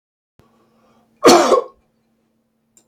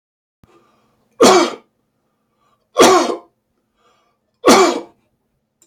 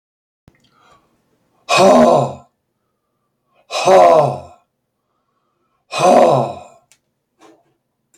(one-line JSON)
{"cough_length": "2.9 s", "cough_amplitude": 30191, "cough_signal_mean_std_ratio": 0.29, "three_cough_length": "5.7 s", "three_cough_amplitude": 32768, "three_cough_signal_mean_std_ratio": 0.34, "exhalation_length": "8.2 s", "exhalation_amplitude": 30265, "exhalation_signal_mean_std_ratio": 0.39, "survey_phase": "beta (2021-08-13 to 2022-03-07)", "age": "45-64", "gender": "Male", "wearing_mask": "No", "symptom_none": true, "symptom_onset": "13 days", "smoker_status": "Never smoked", "respiratory_condition_asthma": false, "respiratory_condition_other": false, "recruitment_source": "REACT", "submission_delay": "2 days", "covid_test_result": "Negative", "covid_test_method": "RT-qPCR", "influenza_a_test_result": "Negative", "influenza_b_test_result": "Negative"}